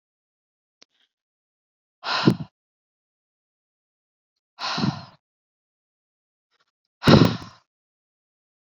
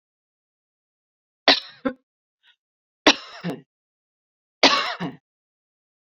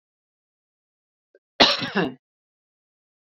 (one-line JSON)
{"exhalation_length": "8.6 s", "exhalation_amplitude": 28001, "exhalation_signal_mean_std_ratio": 0.21, "three_cough_length": "6.1 s", "three_cough_amplitude": 30631, "three_cough_signal_mean_std_ratio": 0.23, "cough_length": "3.2 s", "cough_amplitude": 31872, "cough_signal_mean_std_ratio": 0.25, "survey_phase": "beta (2021-08-13 to 2022-03-07)", "age": "45-64", "gender": "Female", "wearing_mask": "No", "symptom_none": true, "smoker_status": "Ex-smoker", "respiratory_condition_asthma": false, "respiratory_condition_other": false, "recruitment_source": "REACT", "submission_delay": "1 day", "covid_test_result": "Negative", "covid_test_method": "RT-qPCR"}